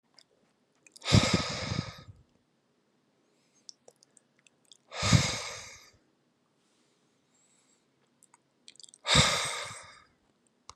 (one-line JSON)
{"exhalation_length": "10.8 s", "exhalation_amplitude": 14540, "exhalation_signal_mean_std_ratio": 0.3, "survey_phase": "beta (2021-08-13 to 2022-03-07)", "age": "45-64", "gender": "Male", "wearing_mask": "No", "symptom_none": true, "smoker_status": "Never smoked", "respiratory_condition_asthma": false, "respiratory_condition_other": false, "recruitment_source": "REACT", "submission_delay": "2 days", "covid_test_result": "Negative", "covid_test_method": "RT-qPCR", "influenza_a_test_result": "Negative", "influenza_b_test_result": "Negative"}